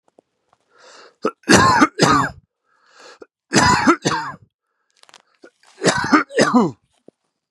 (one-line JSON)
{"three_cough_length": "7.5 s", "three_cough_amplitude": 32768, "three_cough_signal_mean_std_ratio": 0.43, "survey_phase": "beta (2021-08-13 to 2022-03-07)", "age": "45-64", "gender": "Male", "wearing_mask": "No", "symptom_cough_any": true, "symptom_runny_or_blocked_nose": true, "symptom_fatigue": true, "symptom_headache": true, "symptom_onset": "5 days", "smoker_status": "Never smoked", "respiratory_condition_asthma": false, "respiratory_condition_other": false, "recruitment_source": "Test and Trace", "submission_delay": "1 day", "covid_test_result": "Positive", "covid_test_method": "RT-qPCR", "covid_ct_value": 14.5, "covid_ct_gene": "N gene", "covid_ct_mean": 15.1, "covid_viral_load": "11000000 copies/ml", "covid_viral_load_category": "High viral load (>1M copies/ml)"}